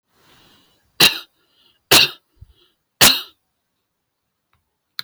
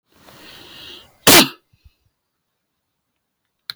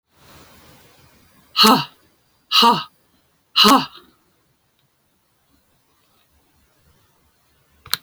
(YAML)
three_cough_length: 5.0 s
three_cough_amplitude: 32768
three_cough_signal_mean_std_ratio: 0.24
cough_length: 3.8 s
cough_amplitude: 32768
cough_signal_mean_std_ratio: 0.21
exhalation_length: 8.0 s
exhalation_amplitude: 32768
exhalation_signal_mean_std_ratio: 0.26
survey_phase: alpha (2021-03-01 to 2021-08-12)
age: 45-64
gender: Female
wearing_mask: 'No'
symptom_none: true
smoker_status: Never smoked
respiratory_condition_asthma: false
respiratory_condition_other: false
recruitment_source: REACT
submission_delay: 1 day
covid_test_result: Negative
covid_test_method: RT-qPCR